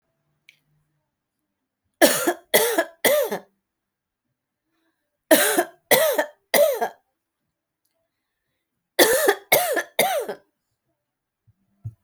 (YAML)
three_cough_length: 12.0 s
three_cough_amplitude: 32767
three_cough_signal_mean_std_ratio: 0.38
survey_phase: alpha (2021-03-01 to 2021-08-12)
age: 18-44
gender: Female
wearing_mask: 'No'
symptom_none: true
symptom_onset: 12 days
smoker_status: Never smoked
respiratory_condition_asthma: false
respiratory_condition_other: false
recruitment_source: REACT
submission_delay: 2 days
covid_test_result: Negative
covid_test_method: RT-qPCR